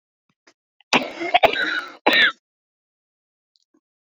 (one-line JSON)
{"cough_length": "4.0 s", "cough_amplitude": 32768, "cough_signal_mean_std_ratio": 0.35, "survey_phase": "beta (2021-08-13 to 2022-03-07)", "age": "65+", "gender": "Female", "wearing_mask": "No", "symptom_cough_any": true, "symptom_runny_or_blocked_nose": true, "symptom_fatigue": true, "symptom_onset": "10 days", "smoker_status": "Never smoked", "respiratory_condition_asthma": true, "respiratory_condition_other": false, "recruitment_source": "REACT", "submission_delay": "2 days", "covid_test_result": "Negative", "covid_test_method": "RT-qPCR"}